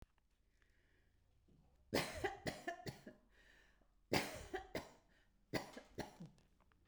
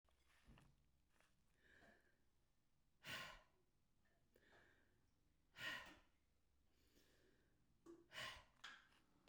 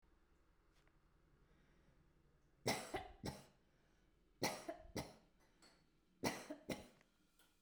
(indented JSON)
{
  "cough_length": "6.9 s",
  "cough_amplitude": 2338,
  "cough_signal_mean_std_ratio": 0.38,
  "exhalation_length": "9.3 s",
  "exhalation_amplitude": 383,
  "exhalation_signal_mean_std_ratio": 0.42,
  "three_cough_length": "7.6 s",
  "three_cough_amplitude": 1762,
  "three_cough_signal_mean_std_ratio": 0.36,
  "survey_phase": "beta (2021-08-13 to 2022-03-07)",
  "age": "65+",
  "gender": "Female",
  "wearing_mask": "No",
  "symptom_none": true,
  "smoker_status": "Never smoked",
  "respiratory_condition_asthma": false,
  "respiratory_condition_other": false,
  "recruitment_source": "REACT",
  "submission_delay": "1 day",
  "covid_test_result": "Negative",
  "covid_test_method": "RT-qPCR",
  "influenza_a_test_result": "Negative",
  "influenza_b_test_result": "Negative"
}